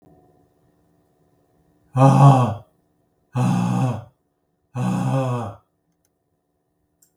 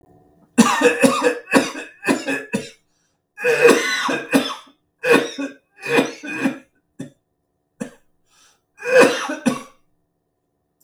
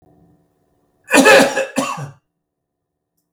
{"exhalation_length": "7.2 s", "exhalation_amplitude": 32422, "exhalation_signal_mean_std_ratio": 0.39, "cough_length": "10.8 s", "cough_amplitude": 32768, "cough_signal_mean_std_ratio": 0.45, "three_cough_length": "3.3 s", "three_cough_amplitude": 32768, "three_cough_signal_mean_std_ratio": 0.35, "survey_phase": "beta (2021-08-13 to 2022-03-07)", "age": "65+", "gender": "Male", "wearing_mask": "No", "symptom_cough_any": true, "smoker_status": "Ex-smoker", "respiratory_condition_asthma": false, "respiratory_condition_other": false, "recruitment_source": "REACT", "submission_delay": "2 days", "covid_test_result": "Negative", "covid_test_method": "RT-qPCR"}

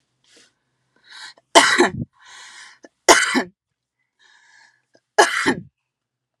{"three_cough_length": "6.4 s", "three_cough_amplitude": 32768, "three_cough_signal_mean_std_ratio": 0.3, "survey_phase": "beta (2021-08-13 to 2022-03-07)", "age": "18-44", "gender": "Female", "wearing_mask": "No", "symptom_none": true, "smoker_status": "Ex-smoker", "respiratory_condition_asthma": false, "respiratory_condition_other": false, "recruitment_source": "REACT", "submission_delay": "1 day", "covid_test_result": "Negative", "covid_test_method": "RT-qPCR"}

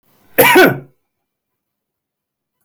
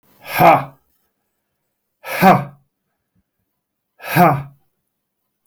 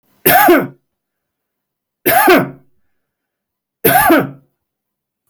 {"cough_length": "2.6 s", "cough_amplitude": 32768, "cough_signal_mean_std_ratio": 0.32, "exhalation_length": "5.5 s", "exhalation_amplitude": 30740, "exhalation_signal_mean_std_ratio": 0.32, "three_cough_length": "5.3 s", "three_cough_amplitude": 32768, "three_cough_signal_mean_std_ratio": 0.42, "survey_phase": "alpha (2021-03-01 to 2021-08-12)", "age": "45-64", "gender": "Male", "wearing_mask": "No", "symptom_none": true, "smoker_status": "Ex-smoker", "respiratory_condition_asthma": false, "respiratory_condition_other": false, "recruitment_source": "REACT", "submission_delay": "4 days", "covid_test_result": "Negative", "covid_test_method": "RT-qPCR"}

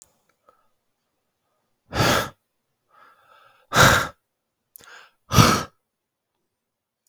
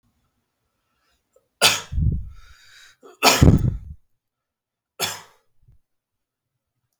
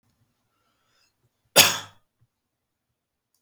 {"exhalation_length": "7.1 s", "exhalation_amplitude": 32766, "exhalation_signal_mean_std_ratio": 0.28, "three_cough_length": "7.0 s", "three_cough_amplitude": 32768, "three_cough_signal_mean_std_ratio": 0.29, "cough_length": "3.4 s", "cough_amplitude": 32768, "cough_signal_mean_std_ratio": 0.17, "survey_phase": "beta (2021-08-13 to 2022-03-07)", "age": "18-44", "gender": "Male", "wearing_mask": "No", "symptom_none": true, "smoker_status": "Never smoked", "respiratory_condition_asthma": false, "respiratory_condition_other": false, "recruitment_source": "REACT", "submission_delay": "1 day", "covid_test_result": "Negative", "covid_test_method": "RT-qPCR", "influenza_a_test_result": "Negative", "influenza_b_test_result": "Negative"}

